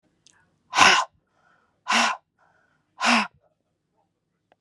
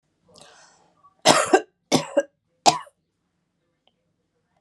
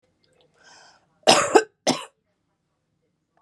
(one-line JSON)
{"exhalation_length": "4.6 s", "exhalation_amplitude": 29824, "exhalation_signal_mean_std_ratio": 0.32, "three_cough_length": "4.6 s", "three_cough_amplitude": 32735, "three_cough_signal_mean_std_ratio": 0.26, "cough_length": "3.4 s", "cough_amplitude": 31347, "cough_signal_mean_std_ratio": 0.26, "survey_phase": "beta (2021-08-13 to 2022-03-07)", "age": "45-64", "gender": "Female", "wearing_mask": "No", "symptom_diarrhoea": true, "symptom_fatigue": true, "symptom_headache": true, "symptom_other": true, "symptom_onset": "3 days", "smoker_status": "Current smoker (1 to 10 cigarettes per day)", "respiratory_condition_asthma": true, "respiratory_condition_other": false, "recruitment_source": "Test and Trace", "submission_delay": "2 days", "covid_test_result": "Positive", "covid_test_method": "RT-qPCR", "covid_ct_value": 27.1, "covid_ct_gene": "S gene"}